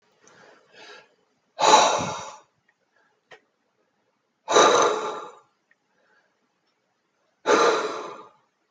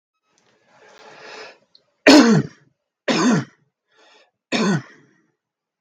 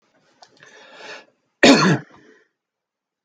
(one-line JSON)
{"exhalation_length": "8.7 s", "exhalation_amplitude": 26300, "exhalation_signal_mean_std_ratio": 0.35, "three_cough_length": "5.8 s", "three_cough_amplitude": 32768, "three_cough_signal_mean_std_ratio": 0.33, "cough_length": "3.2 s", "cough_amplitude": 32768, "cough_signal_mean_std_ratio": 0.27, "survey_phase": "beta (2021-08-13 to 2022-03-07)", "age": "18-44", "gender": "Male", "wearing_mask": "No", "symptom_none": true, "symptom_onset": "10 days", "smoker_status": "Ex-smoker", "respiratory_condition_asthma": false, "respiratory_condition_other": false, "recruitment_source": "REACT", "submission_delay": "2 days", "covid_test_result": "Negative", "covid_test_method": "RT-qPCR"}